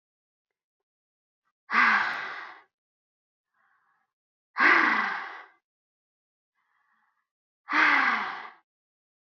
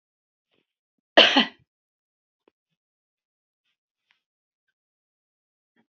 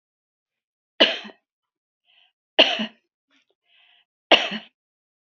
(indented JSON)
{
  "exhalation_length": "9.4 s",
  "exhalation_amplitude": 12745,
  "exhalation_signal_mean_std_ratio": 0.36,
  "cough_length": "5.9 s",
  "cough_amplitude": 30036,
  "cough_signal_mean_std_ratio": 0.15,
  "three_cough_length": "5.4 s",
  "three_cough_amplitude": 28920,
  "three_cough_signal_mean_std_ratio": 0.23,
  "survey_phase": "beta (2021-08-13 to 2022-03-07)",
  "age": "65+",
  "gender": "Female",
  "wearing_mask": "No",
  "symptom_none": true,
  "smoker_status": "Never smoked",
  "respiratory_condition_asthma": false,
  "respiratory_condition_other": false,
  "recruitment_source": "REACT",
  "submission_delay": "9 days",
  "covid_test_result": "Negative",
  "covid_test_method": "RT-qPCR",
  "influenza_a_test_result": "Negative",
  "influenza_b_test_result": "Negative"
}